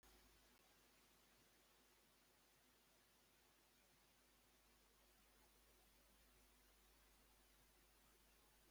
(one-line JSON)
{"three_cough_length": "8.7 s", "three_cough_amplitude": 37, "three_cough_signal_mean_std_ratio": 1.17, "survey_phase": "beta (2021-08-13 to 2022-03-07)", "age": "65+", "gender": "Male", "wearing_mask": "No", "symptom_runny_or_blocked_nose": true, "symptom_onset": "8 days", "smoker_status": "Never smoked", "respiratory_condition_asthma": false, "respiratory_condition_other": false, "recruitment_source": "REACT", "submission_delay": "2 days", "covid_test_result": "Negative", "covid_test_method": "RT-qPCR"}